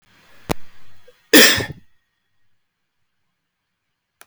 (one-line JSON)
{"cough_length": "4.3 s", "cough_amplitude": 32768, "cough_signal_mean_std_ratio": 0.26, "survey_phase": "alpha (2021-03-01 to 2021-08-12)", "age": "45-64", "gender": "Male", "wearing_mask": "No", "symptom_none": true, "smoker_status": "Never smoked", "respiratory_condition_asthma": false, "respiratory_condition_other": false, "recruitment_source": "REACT", "submission_delay": "10 days", "covid_test_result": "Negative", "covid_test_method": "RT-qPCR"}